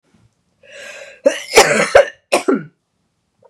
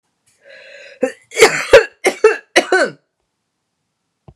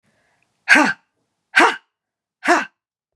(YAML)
cough_length: 3.5 s
cough_amplitude: 32768
cough_signal_mean_std_ratio: 0.37
three_cough_length: 4.4 s
three_cough_amplitude: 32768
three_cough_signal_mean_std_ratio: 0.34
exhalation_length: 3.2 s
exhalation_amplitude: 32750
exhalation_signal_mean_std_ratio: 0.33
survey_phase: beta (2021-08-13 to 2022-03-07)
age: 45-64
gender: Female
wearing_mask: 'No'
symptom_runny_or_blocked_nose: true
symptom_fatigue: true
symptom_headache: true
symptom_other: true
symptom_onset: 4 days
smoker_status: Never smoked
respiratory_condition_asthma: false
respiratory_condition_other: false
recruitment_source: REACT
submission_delay: 1 day
covid_test_result: Positive
covid_test_method: RT-qPCR
covid_ct_value: 18.5
covid_ct_gene: E gene
influenza_a_test_result: Negative
influenza_b_test_result: Negative